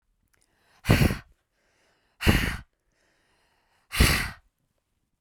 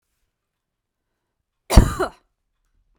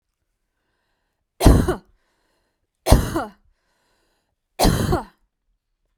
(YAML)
exhalation_length: 5.2 s
exhalation_amplitude: 21944
exhalation_signal_mean_std_ratio: 0.32
cough_length: 3.0 s
cough_amplitude: 32768
cough_signal_mean_std_ratio: 0.19
three_cough_length: 6.0 s
three_cough_amplitude: 32767
three_cough_signal_mean_std_ratio: 0.3
survey_phase: beta (2021-08-13 to 2022-03-07)
age: 18-44
gender: Female
wearing_mask: 'No'
symptom_none: true
smoker_status: Never smoked
respiratory_condition_asthma: false
respiratory_condition_other: false
recruitment_source: REACT
submission_delay: 0 days
covid_test_result: Negative
covid_test_method: RT-qPCR
influenza_a_test_result: Negative
influenza_b_test_result: Negative